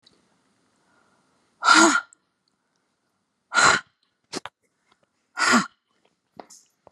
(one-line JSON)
{"exhalation_length": "6.9 s", "exhalation_amplitude": 27097, "exhalation_signal_mean_std_ratio": 0.29, "survey_phase": "beta (2021-08-13 to 2022-03-07)", "age": "45-64", "gender": "Female", "wearing_mask": "No", "symptom_none": true, "smoker_status": "Never smoked", "respiratory_condition_asthma": false, "respiratory_condition_other": false, "recruitment_source": "REACT", "submission_delay": "18 days", "covid_test_result": "Negative", "covid_test_method": "RT-qPCR"}